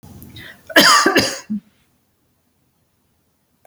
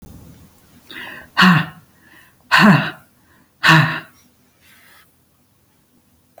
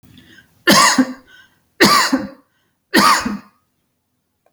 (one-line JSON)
{"cough_length": "3.7 s", "cough_amplitude": 32090, "cough_signal_mean_std_ratio": 0.35, "exhalation_length": "6.4 s", "exhalation_amplitude": 30819, "exhalation_signal_mean_std_ratio": 0.34, "three_cough_length": "4.5 s", "three_cough_amplitude": 32155, "three_cough_signal_mean_std_ratio": 0.43, "survey_phase": "beta (2021-08-13 to 2022-03-07)", "age": "45-64", "gender": "Female", "wearing_mask": "No", "symptom_none": true, "smoker_status": "Never smoked", "respiratory_condition_asthma": false, "respiratory_condition_other": false, "recruitment_source": "REACT", "submission_delay": "1 day", "covid_test_result": "Negative", "covid_test_method": "RT-qPCR"}